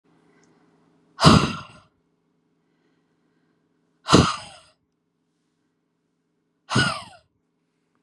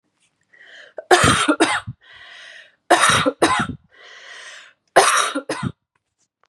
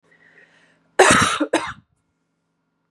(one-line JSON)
{"exhalation_length": "8.0 s", "exhalation_amplitude": 32768, "exhalation_signal_mean_std_ratio": 0.23, "three_cough_length": "6.5 s", "three_cough_amplitude": 32767, "three_cough_signal_mean_std_ratio": 0.44, "cough_length": "2.9 s", "cough_amplitude": 32760, "cough_signal_mean_std_ratio": 0.34, "survey_phase": "beta (2021-08-13 to 2022-03-07)", "age": "18-44", "gender": "Female", "wearing_mask": "No", "symptom_runny_or_blocked_nose": true, "symptom_sore_throat": true, "symptom_fatigue": true, "symptom_headache": true, "symptom_onset": "2 days", "smoker_status": "Never smoked", "respiratory_condition_asthma": false, "respiratory_condition_other": false, "recruitment_source": "REACT", "submission_delay": "2 days", "covid_test_result": "Negative", "covid_test_method": "RT-qPCR", "influenza_a_test_result": "Negative", "influenza_b_test_result": "Negative"}